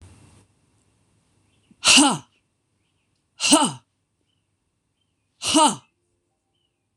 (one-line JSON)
{"exhalation_length": "7.0 s", "exhalation_amplitude": 26027, "exhalation_signal_mean_std_ratio": 0.28, "survey_phase": "beta (2021-08-13 to 2022-03-07)", "age": "45-64", "gender": "Female", "wearing_mask": "No", "symptom_cough_any": true, "symptom_runny_or_blocked_nose": true, "symptom_headache": true, "smoker_status": "Never smoked", "respiratory_condition_asthma": true, "respiratory_condition_other": false, "recruitment_source": "Test and Trace", "submission_delay": "1 day", "covid_test_result": "Positive", "covid_test_method": "RT-qPCR", "covid_ct_value": 29.5, "covid_ct_gene": "N gene"}